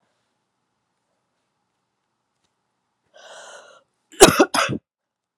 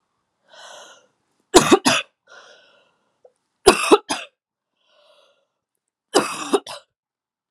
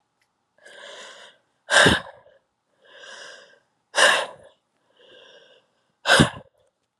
{"cough_length": "5.4 s", "cough_amplitude": 32768, "cough_signal_mean_std_ratio": 0.19, "three_cough_length": "7.5 s", "three_cough_amplitude": 32768, "three_cough_signal_mean_std_ratio": 0.26, "exhalation_length": "7.0 s", "exhalation_amplitude": 28623, "exhalation_signal_mean_std_ratio": 0.29, "survey_phase": "beta (2021-08-13 to 2022-03-07)", "age": "18-44", "gender": "Female", "wearing_mask": "No", "symptom_cough_any": true, "symptom_runny_or_blocked_nose": true, "symptom_sore_throat": true, "symptom_onset": "5 days", "smoker_status": "Never smoked", "respiratory_condition_asthma": false, "respiratory_condition_other": false, "recruitment_source": "Test and Trace", "submission_delay": "2 days", "covid_test_result": "Negative", "covid_test_method": "RT-qPCR"}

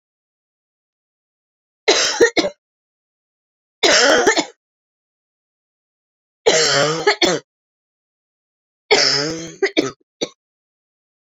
{"three_cough_length": "11.3 s", "three_cough_amplitude": 32768, "three_cough_signal_mean_std_ratio": 0.38, "survey_phase": "beta (2021-08-13 to 2022-03-07)", "age": "45-64", "gender": "Female", "wearing_mask": "No", "symptom_new_continuous_cough": true, "symptom_runny_or_blocked_nose": true, "symptom_shortness_of_breath": true, "symptom_fatigue": true, "symptom_headache": true, "symptom_change_to_sense_of_smell_or_taste": true, "symptom_other": true, "smoker_status": "Ex-smoker", "respiratory_condition_asthma": false, "respiratory_condition_other": false, "recruitment_source": "Test and Trace", "submission_delay": "31 days", "covid_test_result": "Negative", "covid_test_method": "RT-qPCR"}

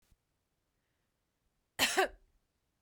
{"cough_length": "2.8 s", "cough_amplitude": 5803, "cough_signal_mean_std_ratio": 0.24, "survey_phase": "beta (2021-08-13 to 2022-03-07)", "age": "18-44", "gender": "Female", "wearing_mask": "No", "symptom_runny_or_blocked_nose": true, "smoker_status": "Ex-smoker", "respiratory_condition_asthma": false, "respiratory_condition_other": false, "recruitment_source": "REACT", "submission_delay": "1 day", "covid_test_result": "Negative", "covid_test_method": "RT-qPCR", "influenza_a_test_result": "Negative", "influenza_b_test_result": "Negative"}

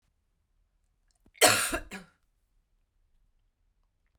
{"cough_length": "4.2 s", "cough_amplitude": 15177, "cough_signal_mean_std_ratio": 0.22, "survey_phase": "beta (2021-08-13 to 2022-03-07)", "age": "45-64", "gender": "Female", "wearing_mask": "No", "symptom_cough_any": true, "symptom_runny_or_blocked_nose": true, "symptom_fatigue": true, "symptom_change_to_sense_of_smell_or_taste": true, "symptom_other": true, "symptom_onset": "2 days", "smoker_status": "Never smoked", "respiratory_condition_asthma": false, "respiratory_condition_other": false, "recruitment_source": "Test and Trace", "submission_delay": "1 day", "covid_test_result": "Positive", "covid_test_method": "RT-qPCR", "covid_ct_value": 30.7, "covid_ct_gene": "N gene"}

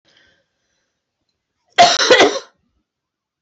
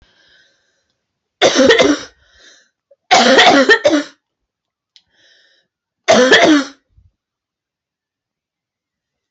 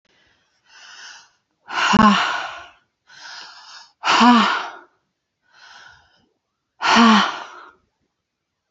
{"cough_length": "3.4 s", "cough_amplitude": 30685, "cough_signal_mean_std_ratio": 0.32, "three_cough_length": "9.3 s", "three_cough_amplitude": 32529, "three_cough_signal_mean_std_ratio": 0.39, "exhalation_length": "8.7 s", "exhalation_amplitude": 28081, "exhalation_signal_mean_std_ratio": 0.38, "survey_phase": "alpha (2021-03-01 to 2021-08-12)", "age": "45-64", "gender": "Female", "wearing_mask": "No", "symptom_none": true, "smoker_status": "Never smoked", "respiratory_condition_asthma": false, "respiratory_condition_other": false, "recruitment_source": "REACT", "submission_delay": "1 day", "covid_test_result": "Negative", "covid_test_method": "RT-qPCR"}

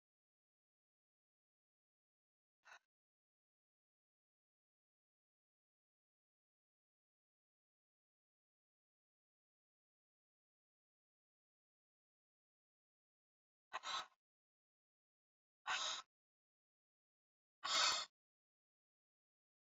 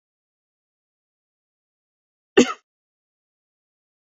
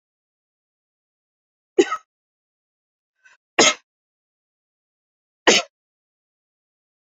{"exhalation_length": "19.7 s", "exhalation_amplitude": 2304, "exhalation_signal_mean_std_ratio": 0.16, "cough_length": "4.2 s", "cough_amplitude": 26378, "cough_signal_mean_std_ratio": 0.12, "three_cough_length": "7.1 s", "three_cough_amplitude": 29106, "three_cough_signal_mean_std_ratio": 0.18, "survey_phase": "beta (2021-08-13 to 2022-03-07)", "age": "45-64", "gender": "Female", "wearing_mask": "No", "symptom_none": true, "smoker_status": "Never smoked", "respiratory_condition_asthma": false, "respiratory_condition_other": false, "recruitment_source": "REACT", "submission_delay": "1 day", "covid_test_result": "Negative", "covid_test_method": "RT-qPCR", "influenza_a_test_result": "Negative", "influenza_b_test_result": "Negative"}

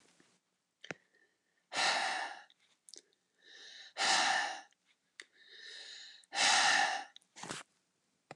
{"exhalation_length": "8.4 s", "exhalation_amplitude": 5308, "exhalation_signal_mean_std_ratio": 0.42, "survey_phase": "beta (2021-08-13 to 2022-03-07)", "age": "45-64", "gender": "Male", "wearing_mask": "No", "symptom_sore_throat": true, "symptom_fatigue": true, "symptom_onset": "3 days", "smoker_status": "Ex-smoker", "respiratory_condition_asthma": false, "respiratory_condition_other": false, "recruitment_source": "Test and Trace", "submission_delay": "2 days", "covid_test_result": "Positive", "covid_test_method": "RT-qPCR"}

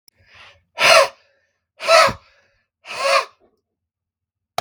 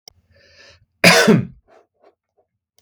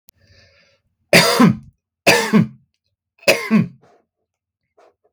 {"exhalation_length": "4.6 s", "exhalation_amplitude": 32768, "exhalation_signal_mean_std_ratio": 0.34, "cough_length": "2.8 s", "cough_amplitude": 32768, "cough_signal_mean_std_ratio": 0.31, "three_cough_length": "5.1 s", "three_cough_amplitude": 32768, "three_cough_signal_mean_std_ratio": 0.37, "survey_phase": "beta (2021-08-13 to 2022-03-07)", "age": "18-44", "gender": "Male", "wearing_mask": "No", "symptom_none": true, "symptom_onset": "11 days", "smoker_status": "Never smoked", "respiratory_condition_asthma": false, "respiratory_condition_other": false, "recruitment_source": "REACT", "submission_delay": "2 days", "covid_test_result": "Negative", "covid_test_method": "RT-qPCR"}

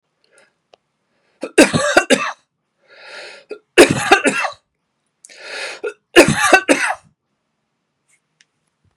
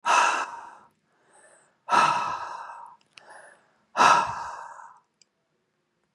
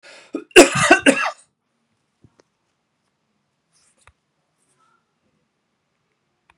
{"three_cough_length": "9.0 s", "three_cough_amplitude": 32768, "three_cough_signal_mean_std_ratio": 0.34, "exhalation_length": "6.1 s", "exhalation_amplitude": 21740, "exhalation_signal_mean_std_ratio": 0.4, "cough_length": "6.6 s", "cough_amplitude": 32768, "cough_signal_mean_std_ratio": 0.21, "survey_phase": "beta (2021-08-13 to 2022-03-07)", "age": "45-64", "gender": "Male", "wearing_mask": "No", "symptom_none": true, "smoker_status": "Never smoked", "respiratory_condition_asthma": false, "respiratory_condition_other": false, "recruitment_source": "REACT", "submission_delay": "1 day", "covid_test_result": "Negative", "covid_test_method": "RT-qPCR"}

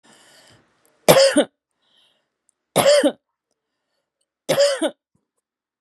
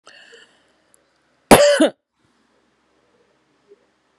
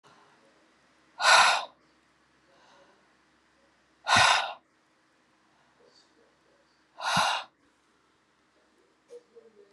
{"three_cough_length": "5.8 s", "three_cough_amplitude": 32768, "three_cough_signal_mean_std_ratio": 0.34, "cough_length": "4.2 s", "cough_amplitude": 32768, "cough_signal_mean_std_ratio": 0.24, "exhalation_length": "9.7 s", "exhalation_amplitude": 14357, "exhalation_signal_mean_std_ratio": 0.28, "survey_phase": "beta (2021-08-13 to 2022-03-07)", "age": "45-64", "gender": "Female", "wearing_mask": "No", "symptom_none": true, "smoker_status": "Never smoked", "respiratory_condition_asthma": false, "respiratory_condition_other": false, "recruitment_source": "REACT", "submission_delay": "4 days", "covid_test_result": "Negative", "covid_test_method": "RT-qPCR"}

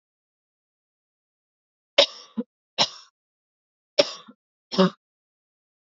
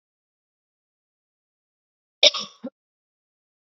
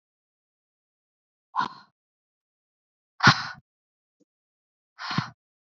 {"three_cough_length": "5.8 s", "three_cough_amplitude": 29983, "three_cough_signal_mean_std_ratio": 0.2, "cough_length": "3.7 s", "cough_amplitude": 30570, "cough_signal_mean_std_ratio": 0.14, "exhalation_length": "5.7 s", "exhalation_amplitude": 26328, "exhalation_signal_mean_std_ratio": 0.19, "survey_phase": "beta (2021-08-13 to 2022-03-07)", "age": "18-44", "gender": "Female", "wearing_mask": "No", "symptom_cough_any": true, "symptom_runny_or_blocked_nose": true, "symptom_sore_throat": true, "symptom_fatigue": true, "symptom_headache": true, "symptom_change_to_sense_of_smell_or_taste": true, "smoker_status": "Never smoked", "respiratory_condition_asthma": false, "respiratory_condition_other": false, "recruitment_source": "Test and Trace", "submission_delay": "1 day", "covid_test_result": "Positive", "covid_test_method": "LFT"}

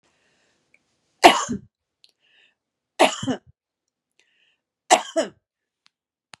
{"three_cough_length": "6.4 s", "three_cough_amplitude": 32768, "three_cough_signal_mean_std_ratio": 0.22, "survey_phase": "beta (2021-08-13 to 2022-03-07)", "age": "65+", "gender": "Female", "wearing_mask": "No", "symptom_none": true, "smoker_status": "Ex-smoker", "respiratory_condition_asthma": false, "respiratory_condition_other": false, "recruitment_source": "REACT", "submission_delay": "0 days", "covid_test_result": "Negative", "covid_test_method": "RT-qPCR", "covid_ct_value": 38.0, "covid_ct_gene": "N gene", "influenza_a_test_result": "Negative", "influenza_b_test_result": "Negative"}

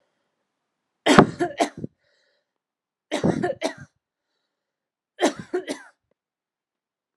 {"three_cough_length": "7.2 s", "three_cough_amplitude": 32768, "three_cough_signal_mean_std_ratio": 0.27, "survey_phase": "alpha (2021-03-01 to 2021-08-12)", "age": "18-44", "gender": "Female", "wearing_mask": "No", "symptom_cough_any": true, "symptom_shortness_of_breath": true, "symptom_diarrhoea": true, "symptom_fatigue": true, "symptom_fever_high_temperature": true, "symptom_headache": true, "symptom_change_to_sense_of_smell_or_taste": true, "symptom_onset": "3 days", "smoker_status": "Ex-smoker", "respiratory_condition_asthma": false, "respiratory_condition_other": false, "recruitment_source": "Test and Trace", "submission_delay": "2 days", "covid_test_result": "Positive", "covid_test_method": "ePCR"}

